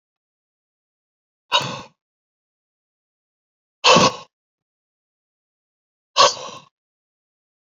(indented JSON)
{
  "exhalation_length": "7.8 s",
  "exhalation_amplitude": 30952,
  "exhalation_signal_mean_std_ratio": 0.22,
  "survey_phase": "beta (2021-08-13 to 2022-03-07)",
  "age": "45-64",
  "gender": "Male",
  "wearing_mask": "No",
  "symptom_cough_any": true,
  "symptom_runny_or_blocked_nose": true,
  "symptom_fatigue": true,
  "symptom_fever_high_temperature": true,
  "symptom_headache": true,
  "smoker_status": "Never smoked",
  "respiratory_condition_asthma": false,
  "respiratory_condition_other": false,
  "recruitment_source": "Test and Trace",
  "submission_delay": "1 day",
  "covid_test_result": "Positive",
  "covid_test_method": "RT-qPCR",
  "covid_ct_value": 22.8,
  "covid_ct_gene": "ORF1ab gene",
  "covid_ct_mean": 23.4,
  "covid_viral_load": "21000 copies/ml",
  "covid_viral_load_category": "Low viral load (10K-1M copies/ml)"
}